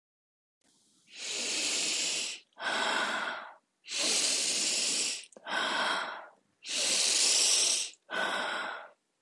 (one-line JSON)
{"exhalation_length": "9.2 s", "exhalation_amplitude": 7450, "exhalation_signal_mean_std_ratio": 0.76, "survey_phase": "beta (2021-08-13 to 2022-03-07)", "age": "45-64", "gender": "Female", "wearing_mask": "No", "symptom_none": true, "smoker_status": "Never smoked", "respiratory_condition_asthma": false, "respiratory_condition_other": false, "recruitment_source": "REACT", "submission_delay": "2 days", "covid_test_result": "Negative", "covid_test_method": "RT-qPCR"}